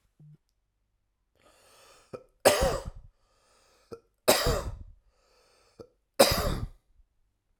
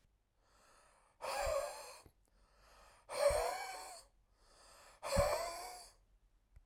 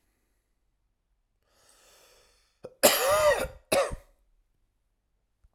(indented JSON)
{
  "three_cough_length": "7.6 s",
  "three_cough_amplitude": 22537,
  "three_cough_signal_mean_std_ratio": 0.3,
  "exhalation_length": "6.7 s",
  "exhalation_amplitude": 2805,
  "exhalation_signal_mean_std_ratio": 0.45,
  "cough_length": "5.5 s",
  "cough_amplitude": 20703,
  "cough_signal_mean_std_ratio": 0.31,
  "survey_phase": "beta (2021-08-13 to 2022-03-07)",
  "age": "18-44",
  "gender": "Male",
  "wearing_mask": "No",
  "symptom_fatigue": true,
  "symptom_headache": true,
  "symptom_change_to_sense_of_smell_or_taste": true,
  "symptom_loss_of_taste": true,
  "symptom_onset": "2 days",
  "smoker_status": "Never smoked",
  "respiratory_condition_asthma": false,
  "respiratory_condition_other": false,
  "recruitment_source": "Test and Trace",
  "submission_delay": "2 days",
  "covid_test_result": "Positive",
  "covid_test_method": "RT-qPCR",
  "covid_ct_value": 33.9,
  "covid_ct_gene": "ORF1ab gene"
}